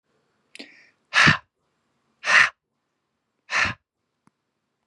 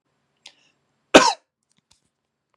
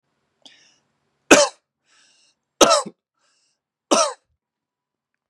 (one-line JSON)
{"exhalation_length": "4.9 s", "exhalation_amplitude": 22901, "exhalation_signal_mean_std_ratio": 0.28, "cough_length": "2.6 s", "cough_amplitude": 32768, "cough_signal_mean_std_ratio": 0.18, "three_cough_length": "5.3 s", "three_cough_amplitude": 32768, "three_cough_signal_mean_std_ratio": 0.24, "survey_phase": "beta (2021-08-13 to 2022-03-07)", "age": "18-44", "gender": "Male", "wearing_mask": "No", "symptom_none": true, "smoker_status": "Never smoked", "respiratory_condition_asthma": false, "respiratory_condition_other": false, "recruitment_source": "REACT", "submission_delay": "2 days", "covid_test_result": "Negative", "covid_test_method": "RT-qPCR"}